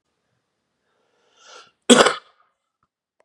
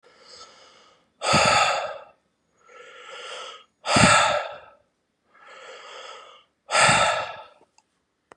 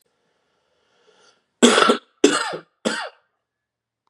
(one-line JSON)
{"cough_length": "3.2 s", "cough_amplitude": 32768, "cough_signal_mean_std_ratio": 0.2, "exhalation_length": "8.4 s", "exhalation_amplitude": 29093, "exhalation_signal_mean_std_ratio": 0.42, "three_cough_length": "4.1 s", "three_cough_amplitude": 32767, "three_cough_signal_mean_std_ratio": 0.31, "survey_phase": "beta (2021-08-13 to 2022-03-07)", "age": "18-44", "gender": "Male", "wearing_mask": "No", "symptom_runny_or_blocked_nose": true, "symptom_fatigue": true, "symptom_headache": true, "symptom_change_to_sense_of_smell_or_taste": true, "symptom_loss_of_taste": true, "symptom_onset": "2 days", "smoker_status": "Ex-smoker", "respiratory_condition_asthma": false, "respiratory_condition_other": false, "recruitment_source": "Test and Trace", "submission_delay": "1 day", "covid_test_result": "Positive", "covid_test_method": "RT-qPCR", "covid_ct_value": 16.8, "covid_ct_gene": "ORF1ab gene", "covid_ct_mean": 17.6, "covid_viral_load": "1700000 copies/ml", "covid_viral_load_category": "High viral load (>1M copies/ml)"}